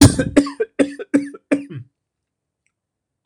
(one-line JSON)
{"three_cough_length": "3.3 s", "three_cough_amplitude": 26028, "three_cough_signal_mean_std_ratio": 0.35, "survey_phase": "beta (2021-08-13 to 2022-03-07)", "age": "65+", "gender": "Male", "wearing_mask": "No", "symptom_none": true, "smoker_status": "Never smoked", "respiratory_condition_asthma": true, "respiratory_condition_other": false, "recruitment_source": "REACT", "submission_delay": "2 days", "covid_test_result": "Negative", "covid_test_method": "RT-qPCR"}